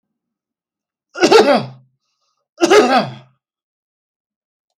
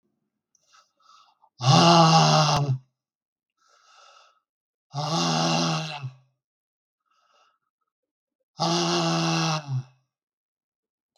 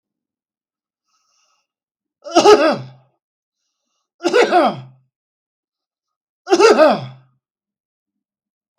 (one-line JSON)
{"cough_length": "4.8 s", "cough_amplitude": 32768, "cough_signal_mean_std_ratio": 0.35, "exhalation_length": "11.2 s", "exhalation_amplitude": 21636, "exhalation_signal_mean_std_ratio": 0.43, "three_cough_length": "8.8 s", "three_cough_amplitude": 32768, "three_cough_signal_mean_std_ratio": 0.32, "survey_phase": "beta (2021-08-13 to 2022-03-07)", "age": "65+", "gender": "Male", "wearing_mask": "No", "symptom_none": true, "smoker_status": "Ex-smoker", "respiratory_condition_asthma": false, "respiratory_condition_other": false, "recruitment_source": "REACT", "submission_delay": "1 day", "covid_test_result": "Negative", "covid_test_method": "RT-qPCR", "influenza_a_test_result": "Unknown/Void", "influenza_b_test_result": "Unknown/Void"}